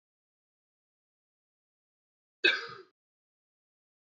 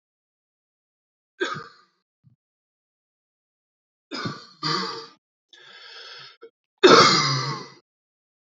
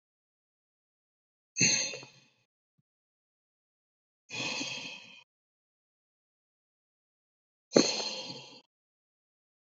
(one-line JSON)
{"cough_length": "4.1 s", "cough_amplitude": 9150, "cough_signal_mean_std_ratio": 0.16, "three_cough_length": "8.4 s", "three_cough_amplitude": 28448, "three_cough_signal_mean_std_ratio": 0.27, "exhalation_length": "9.7 s", "exhalation_amplitude": 19536, "exhalation_signal_mean_std_ratio": 0.25, "survey_phase": "beta (2021-08-13 to 2022-03-07)", "age": "18-44", "gender": "Male", "wearing_mask": "No", "symptom_none": true, "smoker_status": "Never smoked", "respiratory_condition_asthma": false, "respiratory_condition_other": false, "recruitment_source": "Test and Trace", "submission_delay": "2 days", "covid_test_result": "Positive", "covid_test_method": "RT-qPCR", "covid_ct_value": 17.5, "covid_ct_gene": "ORF1ab gene", "covid_ct_mean": 17.8, "covid_viral_load": "1500000 copies/ml", "covid_viral_load_category": "High viral load (>1M copies/ml)"}